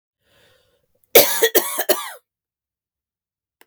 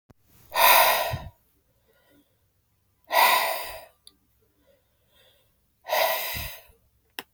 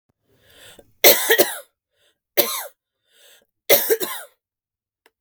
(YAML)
cough_length: 3.7 s
cough_amplitude: 32768
cough_signal_mean_std_ratio: 0.29
exhalation_length: 7.3 s
exhalation_amplitude: 21433
exhalation_signal_mean_std_ratio: 0.37
three_cough_length: 5.2 s
three_cough_amplitude: 32768
three_cough_signal_mean_std_ratio: 0.32
survey_phase: beta (2021-08-13 to 2022-03-07)
age: 18-44
gender: Female
wearing_mask: 'No'
symptom_none: true
symptom_onset: 12 days
smoker_status: Current smoker (1 to 10 cigarettes per day)
respiratory_condition_asthma: false
respiratory_condition_other: false
recruitment_source: REACT
submission_delay: 1 day
covid_test_result: Negative
covid_test_method: RT-qPCR
influenza_a_test_result: Negative
influenza_b_test_result: Negative